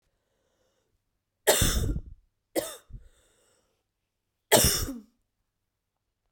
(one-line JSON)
{"three_cough_length": "6.3 s", "three_cough_amplitude": 18750, "three_cough_signal_mean_std_ratio": 0.31, "survey_phase": "beta (2021-08-13 to 2022-03-07)", "age": "18-44", "gender": "Female", "wearing_mask": "No", "symptom_cough_any": true, "symptom_runny_or_blocked_nose": true, "symptom_headache": true, "smoker_status": "Never smoked", "respiratory_condition_asthma": false, "respiratory_condition_other": false, "recruitment_source": "Test and Trace", "submission_delay": "2 days", "covid_test_result": "Positive", "covid_test_method": "RT-qPCR", "covid_ct_value": 15.6, "covid_ct_gene": "ORF1ab gene"}